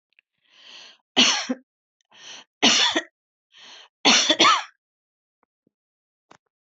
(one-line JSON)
{"three_cough_length": "6.7 s", "three_cough_amplitude": 24328, "three_cough_signal_mean_std_ratio": 0.34, "survey_phase": "beta (2021-08-13 to 2022-03-07)", "age": "45-64", "gender": "Female", "wearing_mask": "No", "symptom_none": true, "smoker_status": "Ex-smoker", "respiratory_condition_asthma": false, "respiratory_condition_other": false, "recruitment_source": "REACT", "submission_delay": "3 days", "covid_test_result": "Negative", "covid_test_method": "RT-qPCR"}